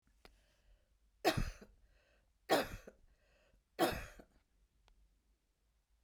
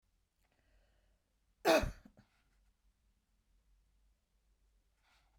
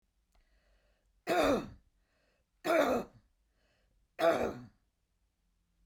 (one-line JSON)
{"three_cough_length": "6.0 s", "three_cough_amplitude": 5009, "three_cough_signal_mean_std_ratio": 0.28, "cough_length": "5.4 s", "cough_amplitude": 5281, "cough_signal_mean_std_ratio": 0.18, "exhalation_length": "5.9 s", "exhalation_amplitude": 5372, "exhalation_signal_mean_std_ratio": 0.36, "survey_phase": "beta (2021-08-13 to 2022-03-07)", "age": "45-64", "gender": "Female", "wearing_mask": "No", "symptom_none": true, "smoker_status": "Never smoked", "respiratory_condition_asthma": false, "respiratory_condition_other": false, "recruitment_source": "REACT", "submission_delay": "1 day", "covid_test_result": "Negative", "covid_test_method": "RT-qPCR"}